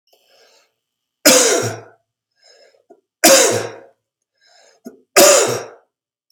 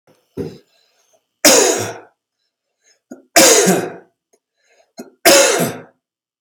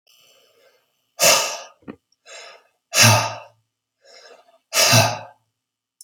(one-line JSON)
{"three_cough_length": "6.3 s", "three_cough_amplitude": 32768, "three_cough_signal_mean_std_ratio": 0.37, "cough_length": "6.4 s", "cough_amplitude": 32768, "cough_signal_mean_std_ratio": 0.4, "exhalation_length": "6.0 s", "exhalation_amplitude": 32768, "exhalation_signal_mean_std_ratio": 0.35, "survey_phase": "beta (2021-08-13 to 2022-03-07)", "age": "45-64", "gender": "Male", "wearing_mask": "No", "symptom_runny_or_blocked_nose": true, "smoker_status": "Ex-smoker", "respiratory_condition_asthma": false, "respiratory_condition_other": false, "recruitment_source": "REACT", "submission_delay": "1 day", "covid_test_result": "Negative", "covid_test_method": "RT-qPCR", "influenza_a_test_result": "Negative", "influenza_b_test_result": "Negative"}